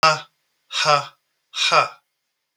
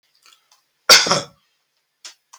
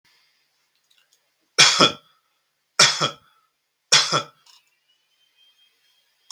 {
  "exhalation_length": "2.6 s",
  "exhalation_amplitude": 32768,
  "exhalation_signal_mean_std_ratio": 0.42,
  "cough_length": "2.4 s",
  "cough_amplitude": 32768,
  "cough_signal_mean_std_ratio": 0.26,
  "three_cough_length": "6.3 s",
  "three_cough_amplitude": 32768,
  "three_cough_signal_mean_std_ratio": 0.27,
  "survey_phase": "beta (2021-08-13 to 2022-03-07)",
  "age": "45-64",
  "gender": "Male",
  "wearing_mask": "No",
  "symptom_fatigue": true,
  "symptom_other": true,
  "smoker_status": "Never smoked",
  "respiratory_condition_asthma": false,
  "respiratory_condition_other": false,
  "recruitment_source": "REACT",
  "submission_delay": "2 days",
  "covid_test_result": "Negative",
  "covid_test_method": "RT-qPCR",
  "influenza_a_test_result": "Negative",
  "influenza_b_test_result": "Negative"
}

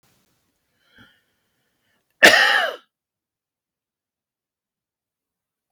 {
  "cough_length": "5.7 s",
  "cough_amplitude": 32767,
  "cough_signal_mean_std_ratio": 0.21,
  "survey_phase": "beta (2021-08-13 to 2022-03-07)",
  "age": "65+",
  "gender": "Male",
  "wearing_mask": "No",
  "symptom_none": true,
  "smoker_status": "Never smoked",
  "respiratory_condition_asthma": false,
  "respiratory_condition_other": false,
  "recruitment_source": "REACT",
  "submission_delay": "2 days",
  "covid_test_result": "Negative",
  "covid_test_method": "RT-qPCR",
  "influenza_a_test_result": "Negative",
  "influenza_b_test_result": "Negative"
}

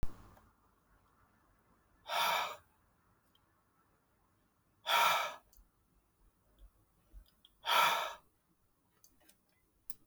{
  "exhalation_length": "10.1 s",
  "exhalation_amplitude": 4692,
  "exhalation_signal_mean_std_ratio": 0.32,
  "survey_phase": "beta (2021-08-13 to 2022-03-07)",
  "age": "45-64",
  "gender": "Female",
  "wearing_mask": "No",
  "symptom_none": true,
  "smoker_status": "Never smoked",
  "respiratory_condition_asthma": false,
  "respiratory_condition_other": true,
  "recruitment_source": "REACT",
  "submission_delay": "0 days",
  "covid_test_result": "Negative",
  "covid_test_method": "RT-qPCR",
  "influenza_a_test_result": "Negative",
  "influenza_b_test_result": "Negative"
}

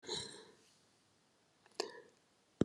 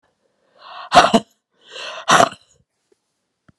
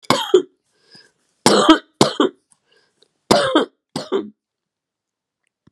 {
  "cough_length": "2.6 s",
  "cough_amplitude": 4731,
  "cough_signal_mean_std_ratio": 0.25,
  "exhalation_length": "3.6 s",
  "exhalation_amplitude": 32768,
  "exhalation_signal_mean_std_ratio": 0.29,
  "three_cough_length": "5.7 s",
  "three_cough_amplitude": 32768,
  "three_cough_signal_mean_std_ratio": 0.35,
  "survey_phase": "beta (2021-08-13 to 2022-03-07)",
  "age": "45-64",
  "gender": "Female",
  "wearing_mask": "No",
  "symptom_cough_any": true,
  "symptom_runny_or_blocked_nose": true,
  "symptom_sore_throat": true,
  "symptom_fatigue": true,
  "symptom_fever_high_temperature": true,
  "symptom_headache": true,
  "symptom_onset": "3 days",
  "smoker_status": "Never smoked",
  "respiratory_condition_asthma": false,
  "respiratory_condition_other": false,
  "recruitment_source": "Test and Trace",
  "submission_delay": "1 day",
  "covid_test_result": "Positive",
  "covid_test_method": "RT-qPCR"
}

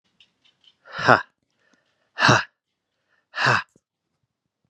{
  "exhalation_length": "4.7 s",
  "exhalation_amplitude": 32704,
  "exhalation_signal_mean_std_ratio": 0.27,
  "survey_phase": "beta (2021-08-13 to 2022-03-07)",
  "age": "18-44",
  "gender": "Male",
  "wearing_mask": "No",
  "symptom_cough_any": true,
  "symptom_sore_throat": true,
  "symptom_headache": true,
  "symptom_change_to_sense_of_smell_or_taste": true,
  "symptom_onset": "4 days",
  "smoker_status": "Never smoked",
  "respiratory_condition_asthma": false,
  "respiratory_condition_other": false,
  "recruitment_source": "Test and Trace",
  "submission_delay": "1 day",
  "covid_test_result": "Positive",
  "covid_test_method": "RT-qPCR",
  "covid_ct_value": 16.3,
  "covid_ct_gene": "ORF1ab gene",
  "covid_ct_mean": 16.6,
  "covid_viral_load": "3600000 copies/ml",
  "covid_viral_load_category": "High viral load (>1M copies/ml)"
}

